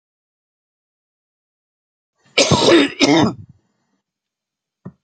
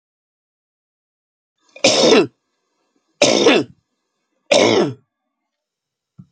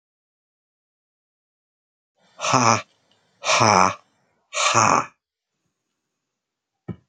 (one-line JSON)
{"cough_length": "5.0 s", "cough_amplitude": 30076, "cough_signal_mean_std_ratio": 0.33, "three_cough_length": "6.3 s", "three_cough_amplitude": 32768, "three_cough_signal_mean_std_ratio": 0.36, "exhalation_length": "7.1 s", "exhalation_amplitude": 30451, "exhalation_signal_mean_std_ratio": 0.32, "survey_phase": "beta (2021-08-13 to 2022-03-07)", "age": "45-64", "gender": "Male", "wearing_mask": "No", "symptom_cough_any": true, "symptom_runny_or_blocked_nose": true, "symptom_other": true, "smoker_status": "Never smoked", "respiratory_condition_asthma": false, "respiratory_condition_other": false, "recruitment_source": "Test and Trace", "submission_delay": "1 day", "covid_test_result": "Positive", "covid_test_method": "RT-qPCR", "covid_ct_value": 24.2, "covid_ct_gene": "ORF1ab gene", "covid_ct_mean": 24.7, "covid_viral_load": "8000 copies/ml", "covid_viral_load_category": "Minimal viral load (< 10K copies/ml)"}